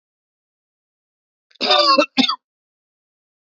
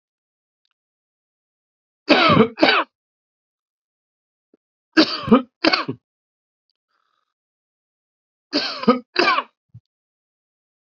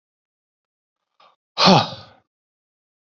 {"cough_length": "3.5 s", "cough_amplitude": 27938, "cough_signal_mean_std_ratio": 0.33, "three_cough_length": "10.9 s", "three_cough_amplitude": 31903, "three_cough_signal_mean_std_ratio": 0.29, "exhalation_length": "3.2 s", "exhalation_amplitude": 32768, "exhalation_signal_mean_std_ratio": 0.24, "survey_phase": "beta (2021-08-13 to 2022-03-07)", "age": "45-64", "gender": "Male", "wearing_mask": "No", "symptom_cough_any": true, "symptom_runny_or_blocked_nose": true, "symptom_onset": "2 days", "smoker_status": "Never smoked", "respiratory_condition_asthma": true, "respiratory_condition_other": false, "recruitment_source": "Test and Trace", "submission_delay": "1 day", "covid_test_result": "Positive", "covid_test_method": "ePCR"}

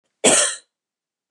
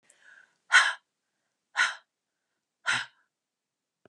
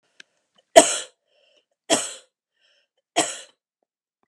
{"cough_length": "1.3 s", "cough_amplitude": 29860, "cough_signal_mean_std_ratio": 0.38, "exhalation_length": "4.1 s", "exhalation_amplitude": 16258, "exhalation_signal_mean_std_ratio": 0.26, "three_cough_length": "4.3 s", "three_cough_amplitude": 32768, "three_cough_signal_mean_std_ratio": 0.21, "survey_phase": "beta (2021-08-13 to 2022-03-07)", "age": "45-64", "gender": "Female", "wearing_mask": "No", "symptom_none": true, "smoker_status": "Never smoked", "respiratory_condition_asthma": true, "respiratory_condition_other": false, "recruitment_source": "REACT", "submission_delay": "2 days", "covid_test_result": "Negative", "covid_test_method": "RT-qPCR", "influenza_a_test_result": "Negative", "influenza_b_test_result": "Negative"}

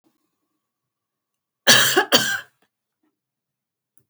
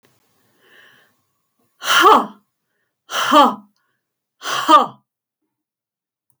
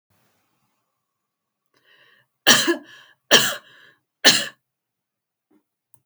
{"cough_length": "4.1 s", "cough_amplitude": 32768, "cough_signal_mean_std_ratio": 0.29, "exhalation_length": "6.4 s", "exhalation_amplitude": 31293, "exhalation_signal_mean_std_ratio": 0.32, "three_cough_length": "6.1 s", "three_cough_amplitude": 32768, "three_cough_signal_mean_std_ratio": 0.25, "survey_phase": "beta (2021-08-13 to 2022-03-07)", "age": "65+", "gender": "Female", "wearing_mask": "No", "symptom_runny_or_blocked_nose": true, "symptom_sore_throat": true, "symptom_onset": "13 days", "smoker_status": "Ex-smoker", "respiratory_condition_asthma": true, "respiratory_condition_other": false, "recruitment_source": "REACT", "submission_delay": "1 day", "covid_test_result": "Negative", "covid_test_method": "RT-qPCR"}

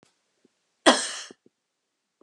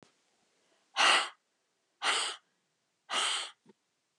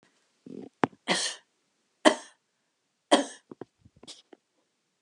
{"cough_length": "2.2 s", "cough_amplitude": 32568, "cough_signal_mean_std_ratio": 0.22, "exhalation_length": "4.2 s", "exhalation_amplitude": 8751, "exhalation_signal_mean_std_ratio": 0.37, "three_cough_length": "5.0 s", "three_cough_amplitude": 28943, "three_cough_signal_mean_std_ratio": 0.22, "survey_phase": "beta (2021-08-13 to 2022-03-07)", "age": "65+", "gender": "Female", "wearing_mask": "No", "symptom_none": true, "smoker_status": "Never smoked", "respiratory_condition_asthma": false, "respiratory_condition_other": false, "recruitment_source": "REACT", "submission_delay": "3 days", "covid_test_result": "Negative", "covid_test_method": "RT-qPCR"}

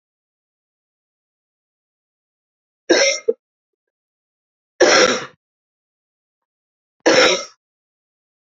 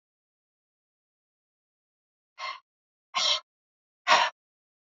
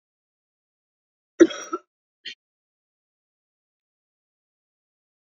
{"three_cough_length": "8.4 s", "three_cough_amplitude": 31416, "three_cough_signal_mean_std_ratio": 0.28, "exhalation_length": "4.9 s", "exhalation_amplitude": 15912, "exhalation_signal_mean_std_ratio": 0.24, "cough_length": "5.3 s", "cough_amplitude": 26580, "cough_signal_mean_std_ratio": 0.11, "survey_phase": "beta (2021-08-13 to 2022-03-07)", "age": "45-64", "gender": "Female", "wearing_mask": "No", "symptom_cough_any": true, "symptom_runny_or_blocked_nose": true, "symptom_fatigue": true, "symptom_headache": true, "symptom_other": true, "smoker_status": "Never smoked", "respiratory_condition_asthma": true, "respiratory_condition_other": false, "recruitment_source": "Test and Trace", "submission_delay": "2 days", "covid_test_result": "Positive", "covid_test_method": "RT-qPCR", "covid_ct_value": 18.3, "covid_ct_gene": "ORF1ab gene", "covid_ct_mean": 18.9, "covid_viral_load": "620000 copies/ml", "covid_viral_load_category": "Low viral load (10K-1M copies/ml)"}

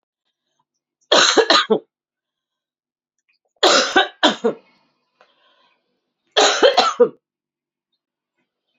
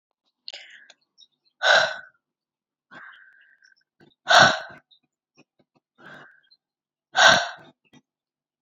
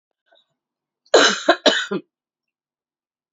{"three_cough_length": "8.8 s", "three_cough_amplitude": 30776, "three_cough_signal_mean_std_ratio": 0.35, "exhalation_length": "8.6 s", "exhalation_amplitude": 27939, "exhalation_signal_mean_std_ratio": 0.26, "cough_length": "3.3 s", "cough_amplitude": 28833, "cough_signal_mean_std_ratio": 0.31, "survey_phase": "beta (2021-08-13 to 2022-03-07)", "age": "18-44", "gender": "Female", "wearing_mask": "No", "symptom_runny_or_blocked_nose": true, "symptom_shortness_of_breath": true, "symptom_fatigue": true, "symptom_headache": true, "symptom_onset": "7 days", "smoker_status": "Current smoker (1 to 10 cigarettes per day)", "respiratory_condition_asthma": false, "respiratory_condition_other": false, "recruitment_source": "Test and Trace", "submission_delay": "2 days", "covid_test_result": "Positive", "covid_test_method": "RT-qPCR", "covid_ct_value": 23.3, "covid_ct_gene": "ORF1ab gene", "covid_ct_mean": 23.4, "covid_viral_load": "21000 copies/ml", "covid_viral_load_category": "Low viral load (10K-1M copies/ml)"}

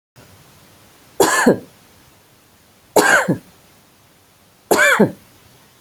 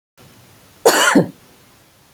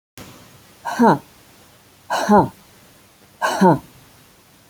{"three_cough_length": "5.8 s", "three_cough_amplitude": 29209, "three_cough_signal_mean_std_ratio": 0.37, "cough_length": "2.1 s", "cough_amplitude": 29694, "cough_signal_mean_std_ratio": 0.36, "exhalation_length": "4.7 s", "exhalation_amplitude": 26940, "exhalation_signal_mean_std_ratio": 0.37, "survey_phase": "beta (2021-08-13 to 2022-03-07)", "age": "45-64", "gender": "Female", "wearing_mask": "No", "symptom_none": true, "smoker_status": "Never smoked", "respiratory_condition_asthma": false, "respiratory_condition_other": false, "recruitment_source": "REACT", "submission_delay": "1 day", "covid_test_result": "Negative", "covid_test_method": "RT-qPCR"}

